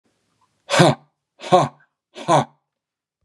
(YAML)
exhalation_length: 3.2 s
exhalation_amplitude: 32517
exhalation_signal_mean_std_ratio: 0.32
survey_phase: beta (2021-08-13 to 2022-03-07)
age: 45-64
gender: Male
wearing_mask: 'No'
symptom_none: true
smoker_status: Never smoked
respiratory_condition_asthma: false
respiratory_condition_other: false
recruitment_source: REACT
submission_delay: 2 days
covid_test_result: Negative
covid_test_method: RT-qPCR
influenza_a_test_result: Negative
influenza_b_test_result: Negative